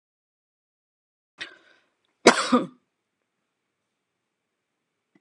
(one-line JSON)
{"cough_length": "5.2 s", "cough_amplitude": 32331, "cough_signal_mean_std_ratio": 0.17, "survey_phase": "alpha (2021-03-01 to 2021-08-12)", "age": "45-64", "gender": "Female", "wearing_mask": "No", "symptom_none": true, "smoker_status": "Never smoked", "respiratory_condition_asthma": false, "respiratory_condition_other": false, "recruitment_source": "REACT", "submission_delay": "2 days", "covid_test_result": "Negative", "covid_test_method": "RT-qPCR"}